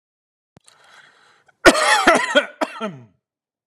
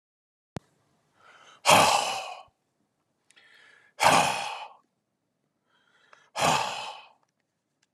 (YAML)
cough_length: 3.7 s
cough_amplitude: 32768
cough_signal_mean_std_ratio: 0.35
exhalation_length: 7.9 s
exhalation_amplitude: 18165
exhalation_signal_mean_std_ratio: 0.33
survey_phase: beta (2021-08-13 to 2022-03-07)
age: 45-64
gender: Male
wearing_mask: 'No'
symptom_cough_any: true
symptom_onset: 12 days
smoker_status: Never smoked
respiratory_condition_asthma: false
respiratory_condition_other: false
recruitment_source: REACT
submission_delay: 1 day
covid_test_result: Negative
covid_test_method: RT-qPCR